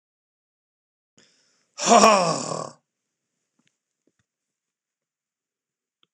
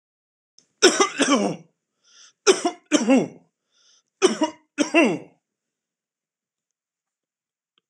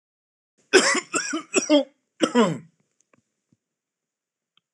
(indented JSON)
{
  "exhalation_length": "6.1 s",
  "exhalation_amplitude": 26028,
  "exhalation_signal_mean_std_ratio": 0.24,
  "three_cough_length": "7.9 s",
  "three_cough_amplitude": 26028,
  "three_cough_signal_mean_std_ratio": 0.35,
  "cough_length": "4.7 s",
  "cough_amplitude": 25168,
  "cough_signal_mean_std_ratio": 0.35,
  "survey_phase": "alpha (2021-03-01 to 2021-08-12)",
  "age": "45-64",
  "gender": "Male",
  "wearing_mask": "No",
  "symptom_none": true,
  "smoker_status": "Ex-smoker",
  "respiratory_condition_asthma": false,
  "respiratory_condition_other": false,
  "recruitment_source": "REACT",
  "submission_delay": "2 days",
  "covid_test_result": "Negative",
  "covid_test_method": "RT-qPCR"
}